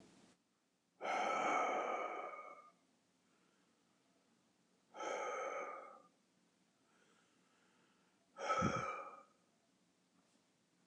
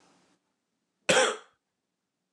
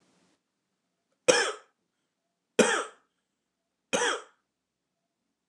{"exhalation_length": "10.9 s", "exhalation_amplitude": 2017, "exhalation_signal_mean_std_ratio": 0.45, "cough_length": "2.3 s", "cough_amplitude": 13553, "cough_signal_mean_std_ratio": 0.27, "three_cough_length": "5.5 s", "three_cough_amplitude": 21787, "three_cough_signal_mean_std_ratio": 0.27, "survey_phase": "beta (2021-08-13 to 2022-03-07)", "age": "45-64", "gender": "Male", "wearing_mask": "No", "symptom_cough_any": true, "symptom_runny_or_blocked_nose": true, "smoker_status": "Never smoked", "respiratory_condition_asthma": false, "respiratory_condition_other": false, "recruitment_source": "REACT", "submission_delay": "3 days", "covid_test_result": "Positive", "covid_test_method": "RT-qPCR", "covid_ct_value": 26.0, "covid_ct_gene": "E gene", "influenza_a_test_result": "Negative", "influenza_b_test_result": "Negative"}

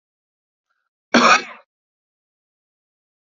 {"cough_length": "3.2 s", "cough_amplitude": 29020, "cough_signal_mean_std_ratio": 0.23, "survey_phase": "alpha (2021-03-01 to 2021-08-12)", "age": "45-64", "gender": "Male", "wearing_mask": "No", "symptom_cough_any": true, "symptom_diarrhoea": true, "symptom_fatigue": true, "symptom_headache": true, "symptom_change_to_sense_of_smell_or_taste": true, "symptom_onset": "6 days", "smoker_status": "Never smoked", "respiratory_condition_asthma": false, "respiratory_condition_other": false, "recruitment_source": "Test and Trace", "submission_delay": "2 days", "covid_test_result": "Positive", "covid_test_method": "RT-qPCR", "covid_ct_value": 24.4, "covid_ct_gene": "S gene", "covid_ct_mean": 24.5, "covid_viral_load": "9000 copies/ml", "covid_viral_load_category": "Minimal viral load (< 10K copies/ml)"}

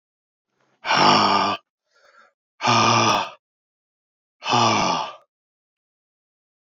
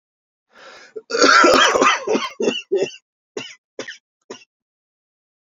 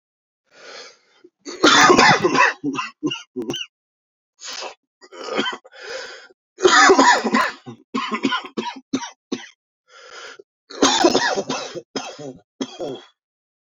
{"exhalation_length": "6.7 s", "exhalation_amplitude": 25688, "exhalation_signal_mean_std_ratio": 0.45, "cough_length": "5.5 s", "cough_amplitude": 28157, "cough_signal_mean_std_ratio": 0.43, "three_cough_length": "13.7 s", "three_cough_amplitude": 30356, "three_cough_signal_mean_std_ratio": 0.44, "survey_phase": "beta (2021-08-13 to 2022-03-07)", "age": "18-44", "gender": "Male", "wearing_mask": "No", "symptom_cough_any": true, "symptom_new_continuous_cough": true, "symptom_runny_or_blocked_nose": true, "symptom_shortness_of_breath": true, "symptom_sore_throat": true, "symptom_abdominal_pain": true, "symptom_diarrhoea": true, "symptom_fatigue": true, "symptom_fever_high_temperature": true, "symptom_headache": true, "symptom_change_to_sense_of_smell_or_taste": true, "symptom_other": true, "symptom_onset": "3 days", "smoker_status": "Never smoked", "respiratory_condition_asthma": false, "respiratory_condition_other": false, "recruitment_source": "Test and Trace", "submission_delay": "2 days", "covid_test_result": "Positive", "covid_test_method": "RT-qPCR"}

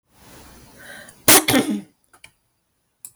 {"cough_length": "3.2 s", "cough_amplitude": 32768, "cough_signal_mean_std_ratio": 0.3, "survey_phase": "beta (2021-08-13 to 2022-03-07)", "age": "45-64", "gender": "Female", "wearing_mask": "No", "symptom_none": true, "smoker_status": "Ex-smoker", "respiratory_condition_asthma": false, "respiratory_condition_other": false, "recruitment_source": "REACT", "submission_delay": "0 days", "covid_test_result": "Negative", "covid_test_method": "RT-qPCR"}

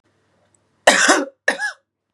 {"cough_length": "2.1 s", "cough_amplitude": 32767, "cough_signal_mean_std_ratio": 0.38, "survey_phase": "beta (2021-08-13 to 2022-03-07)", "age": "18-44", "gender": "Female", "wearing_mask": "No", "symptom_cough_any": true, "symptom_sore_throat": true, "symptom_onset": "5 days", "smoker_status": "Never smoked", "respiratory_condition_asthma": false, "respiratory_condition_other": false, "recruitment_source": "Test and Trace", "submission_delay": "2 days", "covid_test_result": "Negative", "covid_test_method": "RT-qPCR"}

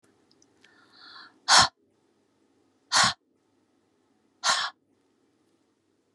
{"exhalation_length": "6.1 s", "exhalation_amplitude": 22487, "exhalation_signal_mean_std_ratio": 0.25, "survey_phase": "beta (2021-08-13 to 2022-03-07)", "age": "65+", "gender": "Female", "wearing_mask": "No", "symptom_none": true, "smoker_status": "Ex-smoker", "respiratory_condition_asthma": true, "respiratory_condition_other": false, "recruitment_source": "REACT", "submission_delay": "2 days", "covid_test_result": "Negative", "covid_test_method": "RT-qPCR"}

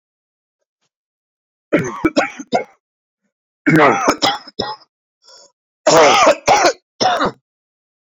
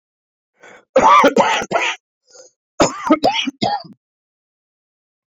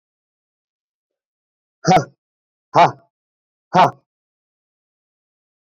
{"three_cough_length": "8.2 s", "three_cough_amplitude": 32768, "three_cough_signal_mean_std_ratio": 0.43, "cough_length": "5.4 s", "cough_amplitude": 28021, "cough_signal_mean_std_ratio": 0.42, "exhalation_length": "5.6 s", "exhalation_amplitude": 29244, "exhalation_signal_mean_std_ratio": 0.23, "survey_phase": "beta (2021-08-13 to 2022-03-07)", "age": "45-64", "gender": "Male", "wearing_mask": "No", "symptom_none": true, "smoker_status": "Ex-smoker", "respiratory_condition_asthma": false, "respiratory_condition_other": false, "recruitment_source": "REACT", "submission_delay": "1 day", "covid_test_result": "Negative", "covid_test_method": "RT-qPCR"}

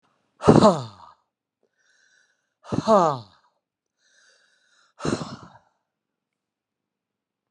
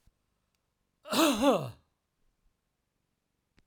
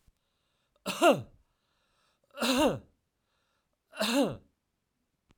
{"exhalation_length": "7.5 s", "exhalation_amplitude": 32300, "exhalation_signal_mean_std_ratio": 0.24, "cough_length": "3.7 s", "cough_amplitude": 8456, "cough_signal_mean_std_ratio": 0.3, "three_cough_length": "5.4 s", "three_cough_amplitude": 10500, "three_cough_signal_mean_std_ratio": 0.33, "survey_phase": "alpha (2021-03-01 to 2021-08-12)", "age": "65+", "gender": "Male", "wearing_mask": "No", "symptom_none": true, "smoker_status": "Ex-smoker", "respiratory_condition_asthma": false, "respiratory_condition_other": false, "recruitment_source": "REACT", "submission_delay": "1 day", "covid_test_result": "Negative", "covid_test_method": "RT-qPCR"}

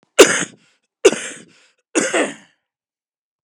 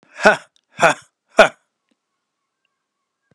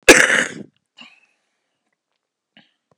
{"three_cough_length": "3.4 s", "three_cough_amplitude": 32768, "three_cough_signal_mean_std_ratio": 0.3, "exhalation_length": "3.3 s", "exhalation_amplitude": 32768, "exhalation_signal_mean_std_ratio": 0.24, "cough_length": "3.0 s", "cough_amplitude": 32768, "cough_signal_mean_std_ratio": 0.25, "survey_phase": "beta (2021-08-13 to 2022-03-07)", "age": "45-64", "gender": "Male", "wearing_mask": "No", "symptom_cough_any": true, "symptom_onset": "12 days", "smoker_status": "Ex-smoker", "respiratory_condition_asthma": true, "respiratory_condition_other": true, "recruitment_source": "REACT", "submission_delay": "3 days", "covid_test_result": "Negative", "covid_test_method": "RT-qPCR", "influenza_a_test_result": "Negative", "influenza_b_test_result": "Negative"}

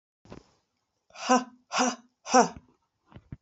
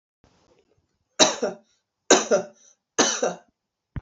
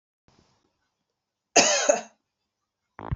{"exhalation_length": "3.4 s", "exhalation_amplitude": 16685, "exhalation_signal_mean_std_ratio": 0.31, "three_cough_length": "4.0 s", "three_cough_amplitude": 27368, "three_cough_signal_mean_std_ratio": 0.34, "cough_length": "3.2 s", "cough_amplitude": 26615, "cough_signal_mean_std_ratio": 0.29, "survey_phase": "beta (2021-08-13 to 2022-03-07)", "age": "18-44", "gender": "Female", "wearing_mask": "No", "symptom_runny_or_blocked_nose": true, "symptom_diarrhoea": true, "smoker_status": "Never smoked", "respiratory_condition_asthma": false, "respiratory_condition_other": false, "recruitment_source": "Test and Trace", "submission_delay": "3 days", "covid_test_result": "Positive", "covid_test_method": "RT-qPCR", "covid_ct_value": 32.5, "covid_ct_gene": "N gene"}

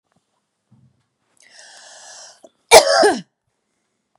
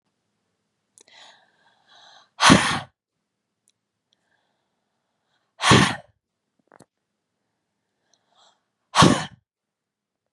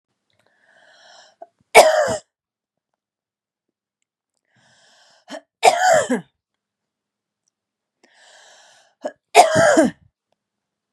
{"cough_length": "4.2 s", "cough_amplitude": 32768, "cough_signal_mean_std_ratio": 0.25, "exhalation_length": "10.3 s", "exhalation_amplitude": 30237, "exhalation_signal_mean_std_ratio": 0.22, "three_cough_length": "10.9 s", "three_cough_amplitude": 32768, "three_cough_signal_mean_std_ratio": 0.28, "survey_phase": "beta (2021-08-13 to 2022-03-07)", "age": "18-44", "gender": "Female", "wearing_mask": "No", "symptom_none": true, "smoker_status": "Never smoked", "respiratory_condition_asthma": false, "respiratory_condition_other": false, "recruitment_source": "REACT", "submission_delay": "2 days", "covid_test_result": "Negative", "covid_test_method": "RT-qPCR", "influenza_a_test_result": "Negative", "influenza_b_test_result": "Negative"}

